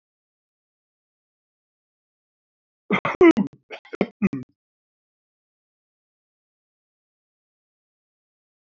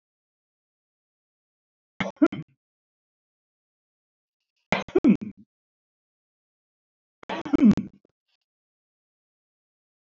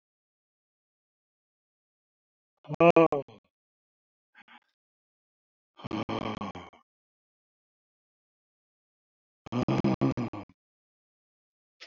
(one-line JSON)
{"cough_length": "8.8 s", "cough_amplitude": 24245, "cough_signal_mean_std_ratio": 0.18, "three_cough_length": "10.2 s", "three_cough_amplitude": 18210, "three_cough_signal_mean_std_ratio": 0.2, "exhalation_length": "11.9 s", "exhalation_amplitude": 15715, "exhalation_signal_mean_std_ratio": 0.23, "survey_phase": "alpha (2021-03-01 to 2021-08-12)", "age": "65+", "gender": "Male", "wearing_mask": "No", "symptom_none": true, "smoker_status": "Ex-smoker", "respiratory_condition_asthma": false, "respiratory_condition_other": false, "recruitment_source": "REACT", "submission_delay": "6 days", "covid_test_result": "Negative", "covid_test_method": "RT-qPCR"}